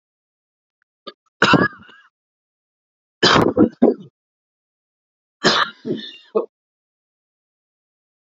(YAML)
three_cough_length: 8.4 s
three_cough_amplitude: 32767
three_cough_signal_mean_std_ratio: 0.3
survey_phase: beta (2021-08-13 to 2022-03-07)
age: 18-44
gender: Male
wearing_mask: 'No'
symptom_cough_any: true
symptom_change_to_sense_of_smell_or_taste: true
symptom_loss_of_taste: true
symptom_onset: 3 days
smoker_status: Never smoked
respiratory_condition_asthma: false
respiratory_condition_other: false
recruitment_source: Test and Trace
submission_delay: 2 days
covid_test_result: Positive
covid_test_method: RT-qPCR
covid_ct_value: 23.0
covid_ct_gene: S gene
covid_ct_mean: 23.1
covid_viral_load: 26000 copies/ml
covid_viral_load_category: Low viral load (10K-1M copies/ml)